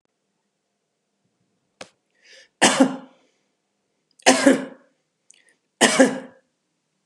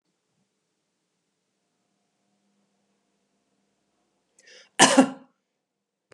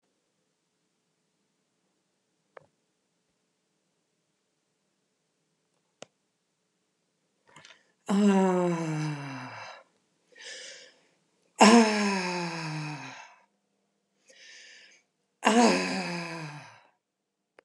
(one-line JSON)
{"three_cough_length": "7.1 s", "three_cough_amplitude": 32719, "three_cough_signal_mean_std_ratio": 0.28, "cough_length": "6.1 s", "cough_amplitude": 30075, "cough_signal_mean_std_ratio": 0.16, "exhalation_length": "17.6 s", "exhalation_amplitude": 21429, "exhalation_signal_mean_std_ratio": 0.32, "survey_phase": "beta (2021-08-13 to 2022-03-07)", "age": "65+", "gender": "Female", "wearing_mask": "No", "symptom_cough_any": true, "smoker_status": "Ex-smoker", "respiratory_condition_asthma": false, "respiratory_condition_other": false, "recruitment_source": "REACT", "submission_delay": "1 day", "covid_test_result": "Negative", "covid_test_method": "RT-qPCR", "influenza_a_test_result": "Negative", "influenza_b_test_result": "Negative"}